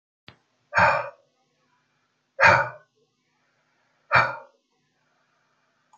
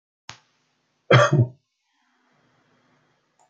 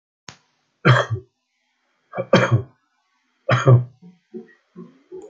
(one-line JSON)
{"exhalation_length": "6.0 s", "exhalation_amplitude": 25258, "exhalation_signal_mean_std_ratio": 0.28, "cough_length": "3.5 s", "cough_amplitude": 26609, "cough_signal_mean_std_ratio": 0.25, "three_cough_length": "5.3 s", "three_cough_amplitude": 28969, "three_cough_signal_mean_std_ratio": 0.34, "survey_phase": "beta (2021-08-13 to 2022-03-07)", "age": "65+", "gender": "Male", "wearing_mask": "No", "symptom_none": true, "smoker_status": "Ex-smoker", "respiratory_condition_asthma": false, "respiratory_condition_other": false, "recruitment_source": "REACT", "submission_delay": "3 days", "covid_test_result": "Negative", "covid_test_method": "RT-qPCR"}